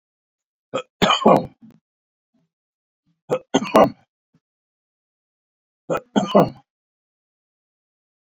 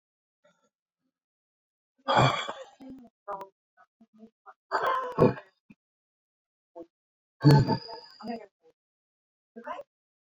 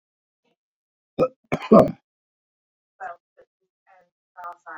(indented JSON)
{
  "three_cough_length": "8.4 s",
  "three_cough_amplitude": 27026,
  "three_cough_signal_mean_std_ratio": 0.27,
  "exhalation_length": "10.3 s",
  "exhalation_amplitude": 17191,
  "exhalation_signal_mean_std_ratio": 0.29,
  "cough_length": "4.8 s",
  "cough_amplitude": 26304,
  "cough_signal_mean_std_ratio": 0.21,
  "survey_phase": "beta (2021-08-13 to 2022-03-07)",
  "age": "65+",
  "gender": "Male",
  "wearing_mask": "No",
  "symptom_cough_any": true,
  "symptom_shortness_of_breath": true,
  "smoker_status": "Ex-smoker",
  "respiratory_condition_asthma": false,
  "respiratory_condition_other": true,
  "recruitment_source": "REACT",
  "submission_delay": "4 days",
  "covid_test_result": "Negative",
  "covid_test_method": "RT-qPCR"
}